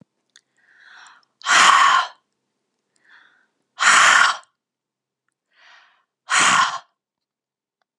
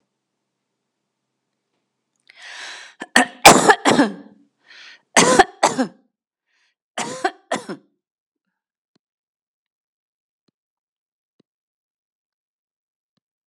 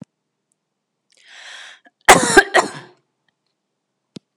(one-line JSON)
{"exhalation_length": "8.0 s", "exhalation_amplitude": 32206, "exhalation_signal_mean_std_ratio": 0.37, "three_cough_length": "13.5 s", "three_cough_amplitude": 32768, "three_cough_signal_mean_std_ratio": 0.23, "cough_length": "4.4 s", "cough_amplitude": 32768, "cough_signal_mean_std_ratio": 0.24, "survey_phase": "beta (2021-08-13 to 2022-03-07)", "age": "45-64", "gender": "Female", "wearing_mask": "No", "symptom_runny_or_blocked_nose": true, "symptom_onset": "7 days", "smoker_status": "Never smoked", "respiratory_condition_asthma": false, "respiratory_condition_other": false, "recruitment_source": "REACT", "submission_delay": "4 days", "covid_test_result": "Negative", "covid_test_method": "RT-qPCR", "influenza_a_test_result": "Negative", "influenza_b_test_result": "Negative"}